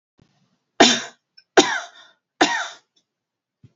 three_cough_length: 3.8 s
three_cough_amplitude: 30645
three_cough_signal_mean_std_ratio: 0.29
survey_phase: beta (2021-08-13 to 2022-03-07)
age: 45-64
gender: Female
wearing_mask: 'No'
symptom_fatigue: true
smoker_status: Never smoked
respiratory_condition_asthma: false
respiratory_condition_other: false
recruitment_source: REACT
submission_delay: 3 days
covid_test_result: Negative
covid_test_method: RT-qPCR
influenza_a_test_result: Negative
influenza_b_test_result: Negative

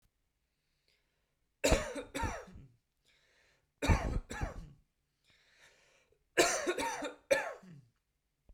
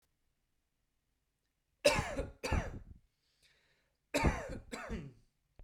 three_cough_length: 8.5 s
three_cough_amplitude: 7778
three_cough_signal_mean_std_ratio: 0.37
cough_length: 5.6 s
cough_amplitude: 6098
cough_signal_mean_std_ratio: 0.36
survey_phase: beta (2021-08-13 to 2022-03-07)
age: 18-44
gender: Male
wearing_mask: 'No'
symptom_cough_any: true
symptom_onset: 7 days
smoker_status: Never smoked
respiratory_condition_asthma: false
respiratory_condition_other: false
recruitment_source: REACT
submission_delay: 3 days
covid_test_result: Negative
covid_test_method: RT-qPCR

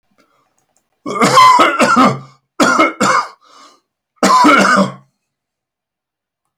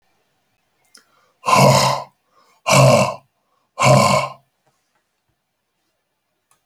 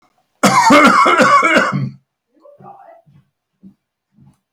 three_cough_length: 6.6 s
three_cough_amplitude: 32767
three_cough_signal_mean_std_ratio: 0.52
exhalation_length: 6.7 s
exhalation_amplitude: 32483
exhalation_signal_mean_std_ratio: 0.38
cough_length: 4.5 s
cough_amplitude: 32768
cough_signal_mean_std_ratio: 0.5
survey_phase: alpha (2021-03-01 to 2021-08-12)
age: 65+
gender: Male
wearing_mask: 'No'
symptom_none: true
smoker_status: Never smoked
respiratory_condition_asthma: false
respiratory_condition_other: false
recruitment_source: REACT
submission_delay: 1 day
covid_test_result: Negative
covid_test_method: RT-qPCR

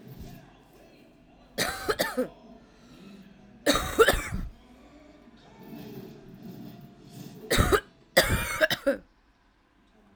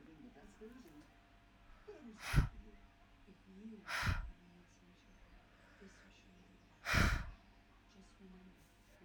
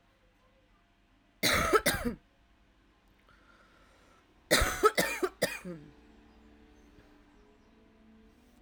three_cough_length: 10.2 s
three_cough_amplitude: 16800
three_cough_signal_mean_std_ratio: 0.4
exhalation_length: 9.0 s
exhalation_amplitude: 4409
exhalation_signal_mean_std_ratio: 0.35
cough_length: 8.6 s
cough_amplitude: 11260
cough_signal_mean_std_ratio: 0.33
survey_phase: alpha (2021-03-01 to 2021-08-12)
age: 18-44
gender: Female
wearing_mask: 'No'
symptom_new_continuous_cough: true
symptom_fatigue: true
symptom_fever_high_temperature: true
symptom_headache: true
symptom_change_to_sense_of_smell_or_taste: true
smoker_status: Ex-smoker
respiratory_condition_asthma: false
respiratory_condition_other: false
recruitment_source: Test and Trace
submission_delay: 1 day
covid_test_result: Positive
covid_test_method: RT-qPCR
covid_ct_value: 28.2
covid_ct_gene: ORF1ab gene
covid_ct_mean: 29.3
covid_viral_load: 250 copies/ml
covid_viral_load_category: Minimal viral load (< 10K copies/ml)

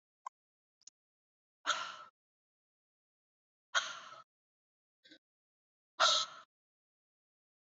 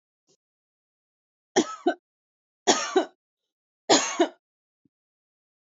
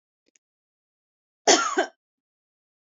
exhalation_length: 7.8 s
exhalation_amplitude: 5972
exhalation_signal_mean_std_ratio: 0.22
three_cough_length: 5.7 s
three_cough_amplitude: 21719
three_cough_signal_mean_std_ratio: 0.28
cough_length: 2.9 s
cough_amplitude: 24880
cough_signal_mean_std_ratio: 0.25
survey_phase: beta (2021-08-13 to 2022-03-07)
age: 45-64
gender: Female
wearing_mask: 'No'
symptom_none: true
smoker_status: Never smoked
respiratory_condition_asthma: false
respiratory_condition_other: false
recruitment_source: REACT
submission_delay: 9 days
covid_test_result: Negative
covid_test_method: RT-qPCR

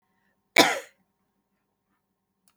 cough_length: 2.6 s
cough_amplitude: 25021
cough_signal_mean_std_ratio: 0.2
survey_phase: beta (2021-08-13 to 2022-03-07)
age: 45-64
gender: Female
wearing_mask: 'No'
symptom_none: true
smoker_status: Never smoked
respiratory_condition_asthma: true
respiratory_condition_other: false
recruitment_source: REACT
submission_delay: 3 days
covid_test_result: Negative
covid_test_method: RT-qPCR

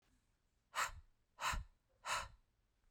exhalation_length: 2.9 s
exhalation_amplitude: 1571
exhalation_signal_mean_std_ratio: 0.4
survey_phase: beta (2021-08-13 to 2022-03-07)
age: 45-64
gender: Female
wearing_mask: 'No'
symptom_runny_or_blocked_nose: true
symptom_headache: true
smoker_status: Never smoked
respiratory_condition_asthma: false
respiratory_condition_other: false
recruitment_source: Test and Trace
submission_delay: 2 days
covid_test_result: Positive
covid_test_method: RT-qPCR
covid_ct_value: 27.4
covid_ct_gene: ORF1ab gene
covid_ct_mean: 27.8
covid_viral_load: 780 copies/ml
covid_viral_load_category: Minimal viral load (< 10K copies/ml)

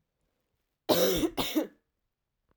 cough_length: 2.6 s
cough_amplitude: 10576
cough_signal_mean_std_ratio: 0.41
survey_phase: alpha (2021-03-01 to 2021-08-12)
age: 18-44
gender: Female
wearing_mask: 'No'
symptom_cough_any: true
symptom_diarrhoea: true
symptom_fever_high_temperature: true
symptom_headache: true
symptom_change_to_sense_of_smell_or_taste: true
symptom_onset: 4 days
smoker_status: Ex-smoker
respiratory_condition_asthma: true
respiratory_condition_other: false
recruitment_source: Test and Trace
submission_delay: 2 days
covid_test_result: Positive
covid_test_method: RT-qPCR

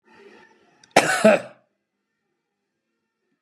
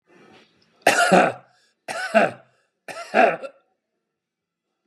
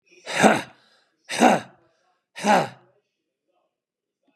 cough_length: 3.4 s
cough_amplitude: 32767
cough_signal_mean_std_ratio: 0.25
three_cough_length: 4.9 s
three_cough_amplitude: 27418
three_cough_signal_mean_std_ratio: 0.35
exhalation_length: 4.4 s
exhalation_amplitude: 30164
exhalation_signal_mean_std_ratio: 0.33
survey_phase: beta (2021-08-13 to 2022-03-07)
age: 45-64
gender: Male
wearing_mask: 'No'
symptom_none: true
smoker_status: Ex-smoker
respiratory_condition_asthma: false
respiratory_condition_other: false
recruitment_source: REACT
submission_delay: 3 days
covid_test_result: Negative
covid_test_method: RT-qPCR
influenza_a_test_result: Negative
influenza_b_test_result: Negative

